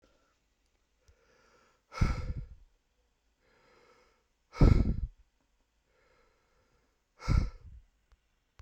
{"exhalation_length": "8.6 s", "exhalation_amplitude": 10248, "exhalation_signal_mean_std_ratio": 0.25, "survey_phase": "beta (2021-08-13 to 2022-03-07)", "age": "18-44", "gender": "Male", "wearing_mask": "No", "symptom_none": true, "smoker_status": "Never smoked", "respiratory_condition_asthma": false, "respiratory_condition_other": false, "recruitment_source": "REACT", "submission_delay": "3 days", "covid_test_result": "Negative", "covid_test_method": "RT-qPCR"}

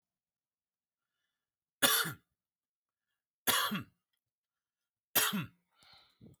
{"three_cough_length": "6.4 s", "three_cough_amplitude": 9013, "three_cough_signal_mean_std_ratio": 0.29, "survey_phase": "alpha (2021-03-01 to 2021-08-12)", "age": "18-44", "gender": "Male", "wearing_mask": "No", "symptom_none": true, "smoker_status": "Never smoked", "respiratory_condition_asthma": false, "respiratory_condition_other": false, "recruitment_source": "REACT", "submission_delay": "1 day", "covid_test_result": "Negative", "covid_test_method": "RT-qPCR"}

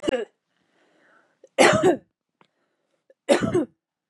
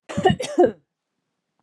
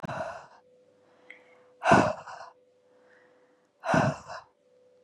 {"three_cough_length": "4.1 s", "three_cough_amplitude": 30738, "three_cough_signal_mean_std_ratio": 0.35, "cough_length": "1.6 s", "cough_amplitude": 22042, "cough_signal_mean_std_ratio": 0.39, "exhalation_length": "5.0 s", "exhalation_amplitude": 18165, "exhalation_signal_mean_std_ratio": 0.33, "survey_phase": "beta (2021-08-13 to 2022-03-07)", "age": "18-44", "gender": "Female", "wearing_mask": "No", "symptom_none": true, "symptom_onset": "11 days", "smoker_status": "Never smoked", "respiratory_condition_asthma": false, "respiratory_condition_other": false, "recruitment_source": "REACT", "submission_delay": "2 days", "covid_test_result": "Negative", "covid_test_method": "RT-qPCR", "influenza_a_test_result": "Negative", "influenza_b_test_result": "Negative"}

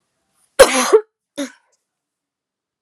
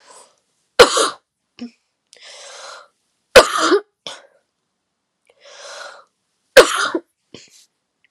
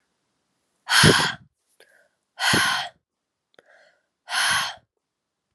{"cough_length": "2.8 s", "cough_amplitude": 32768, "cough_signal_mean_std_ratio": 0.27, "three_cough_length": "8.1 s", "three_cough_amplitude": 32768, "three_cough_signal_mean_std_ratio": 0.26, "exhalation_length": "5.5 s", "exhalation_amplitude": 28873, "exhalation_signal_mean_std_ratio": 0.37, "survey_phase": "beta (2021-08-13 to 2022-03-07)", "age": "18-44", "gender": "Female", "wearing_mask": "No", "symptom_cough_any": true, "symptom_runny_or_blocked_nose": true, "symptom_shortness_of_breath": true, "symptom_sore_throat": true, "symptom_fatigue": true, "symptom_headache": true, "symptom_change_to_sense_of_smell_or_taste": true, "symptom_loss_of_taste": true, "symptom_onset": "5 days", "smoker_status": "Never smoked", "respiratory_condition_asthma": false, "respiratory_condition_other": false, "recruitment_source": "Test and Trace", "submission_delay": "2 days", "covid_test_result": "Positive", "covid_test_method": "RT-qPCR", "covid_ct_value": 25.6, "covid_ct_gene": "ORF1ab gene"}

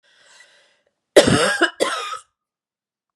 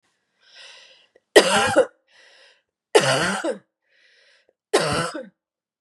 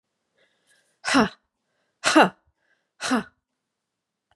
{"cough_length": "3.2 s", "cough_amplitude": 32768, "cough_signal_mean_std_ratio": 0.35, "three_cough_length": "5.8 s", "three_cough_amplitude": 32768, "three_cough_signal_mean_std_ratio": 0.37, "exhalation_length": "4.4 s", "exhalation_amplitude": 25912, "exhalation_signal_mean_std_ratio": 0.27, "survey_phase": "beta (2021-08-13 to 2022-03-07)", "age": "45-64", "gender": "Female", "wearing_mask": "No", "symptom_cough_any": true, "symptom_runny_or_blocked_nose": true, "symptom_sore_throat": true, "symptom_onset": "8 days", "smoker_status": "Ex-smoker", "respiratory_condition_asthma": false, "respiratory_condition_other": false, "recruitment_source": "REACT", "submission_delay": "1 day", "covid_test_result": "Negative", "covid_test_method": "RT-qPCR", "influenza_a_test_result": "Negative", "influenza_b_test_result": "Negative"}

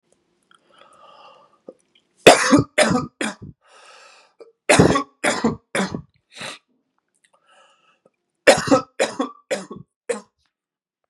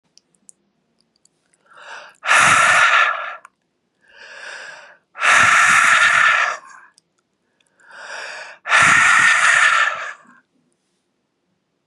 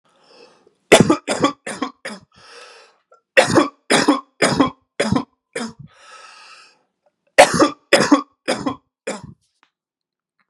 {"three_cough_length": "11.1 s", "three_cough_amplitude": 32768, "three_cough_signal_mean_std_ratio": 0.31, "exhalation_length": "11.9 s", "exhalation_amplitude": 31018, "exhalation_signal_mean_std_ratio": 0.51, "cough_length": "10.5 s", "cough_amplitude": 32768, "cough_signal_mean_std_ratio": 0.36, "survey_phase": "beta (2021-08-13 to 2022-03-07)", "age": "18-44", "gender": "Male", "wearing_mask": "No", "symptom_none": true, "symptom_onset": "10 days", "smoker_status": "Never smoked", "respiratory_condition_asthma": false, "respiratory_condition_other": false, "recruitment_source": "REACT", "submission_delay": "3 days", "covid_test_result": "Negative", "covid_test_method": "RT-qPCR", "influenza_a_test_result": "Negative", "influenza_b_test_result": "Negative"}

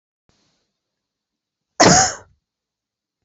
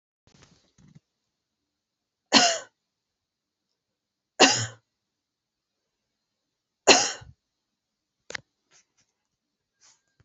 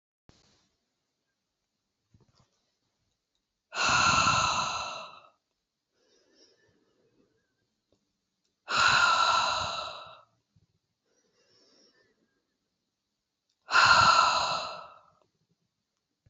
{"cough_length": "3.2 s", "cough_amplitude": 31563, "cough_signal_mean_std_ratio": 0.25, "three_cough_length": "10.2 s", "three_cough_amplitude": 28093, "three_cough_signal_mean_std_ratio": 0.19, "exhalation_length": "16.3 s", "exhalation_amplitude": 12879, "exhalation_signal_mean_std_ratio": 0.36, "survey_phase": "beta (2021-08-13 to 2022-03-07)", "age": "45-64", "gender": "Female", "wearing_mask": "No", "symptom_none": true, "smoker_status": "Never smoked", "respiratory_condition_asthma": false, "respiratory_condition_other": false, "recruitment_source": "REACT", "submission_delay": "1 day", "covid_test_result": "Negative", "covid_test_method": "RT-qPCR"}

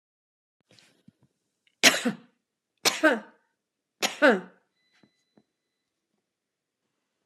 {"cough_length": "7.3 s", "cough_amplitude": 25512, "cough_signal_mean_std_ratio": 0.23, "survey_phase": "alpha (2021-03-01 to 2021-08-12)", "age": "65+", "gender": "Female", "wearing_mask": "No", "symptom_none": true, "smoker_status": "Ex-smoker", "respiratory_condition_asthma": false, "respiratory_condition_other": false, "recruitment_source": "REACT", "submission_delay": "2 days", "covid_test_result": "Negative", "covid_test_method": "RT-qPCR"}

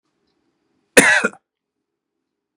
{"cough_length": "2.6 s", "cough_amplitude": 32768, "cough_signal_mean_std_ratio": 0.25, "survey_phase": "beta (2021-08-13 to 2022-03-07)", "age": "45-64", "gender": "Male", "wearing_mask": "No", "symptom_none": true, "smoker_status": "Ex-smoker", "respiratory_condition_asthma": false, "respiratory_condition_other": false, "recruitment_source": "REACT", "submission_delay": "7 days", "covid_test_result": "Negative", "covid_test_method": "RT-qPCR", "influenza_a_test_result": "Unknown/Void", "influenza_b_test_result": "Unknown/Void"}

